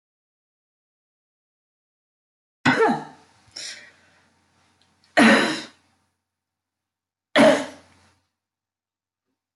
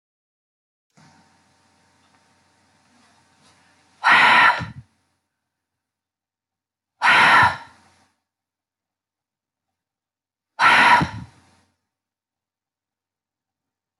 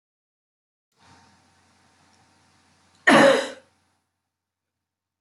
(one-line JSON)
{"three_cough_length": "9.6 s", "three_cough_amplitude": 22238, "three_cough_signal_mean_std_ratio": 0.26, "exhalation_length": "14.0 s", "exhalation_amplitude": 20807, "exhalation_signal_mean_std_ratio": 0.28, "cough_length": "5.2 s", "cough_amplitude": 20515, "cough_signal_mean_std_ratio": 0.22, "survey_phase": "beta (2021-08-13 to 2022-03-07)", "age": "45-64", "gender": "Female", "wearing_mask": "No", "symptom_none": true, "smoker_status": "Never smoked", "respiratory_condition_asthma": false, "respiratory_condition_other": false, "recruitment_source": "REACT", "submission_delay": "1 day", "covid_test_result": "Negative", "covid_test_method": "RT-qPCR", "influenza_a_test_result": "Negative", "influenza_b_test_result": "Negative"}